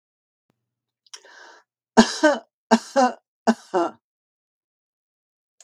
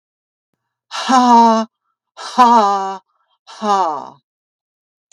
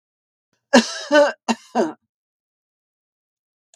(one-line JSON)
{"three_cough_length": "5.6 s", "three_cough_amplitude": 32768, "three_cough_signal_mean_std_ratio": 0.27, "exhalation_length": "5.1 s", "exhalation_amplitude": 32768, "exhalation_signal_mean_std_ratio": 0.46, "cough_length": "3.8 s", "cough_amplitude": 32768, "cough_signal_mean_std_ratio": 0.3, "survey_phase": "beta (2021-08-13 to 2022-03-07)", "age": "65+", "gender": "Female", "wearing_mask": "No", "symptom_none": true, "smoker_status": "Ex-smoker", "respiratory_condition_asthma": false, "respiratory_condition_other": false, "recruitment_source": "REACT", "submission_delay": "3 days", "covid_test_result": "Negative", "covid_test_method": "RT-qPCR", "influenza_a_test_result": "Negative", "influenza_b_test_result": "Negative"}